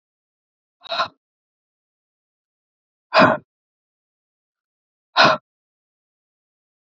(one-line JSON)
{"exhalation_length": "7.0 s", "exhalation_amplitude": 27418, "exhalation_signal_mean_std_ratio": 0.21, "survey_phase": "beta (2021-08-13 to 2022-03-07)", "age": "45-64", "gender": "Female", "wearing_mask": "No", "symptom_change_to_sense_of_smell_or_taste": true, "symptom_onset": "12 days", "smoker_status": "Never smoked", "respiratory_condition_asthma": false, "respiratory_condition_other": false, "recruitment_source": "REACT", "submission_delay": "1 day", "covid_test_result": "Negative", "covid_test_method": "RT-qPCR", "influenza_a_test_result": "Negative", "influenza_b_test_result": "Negative"}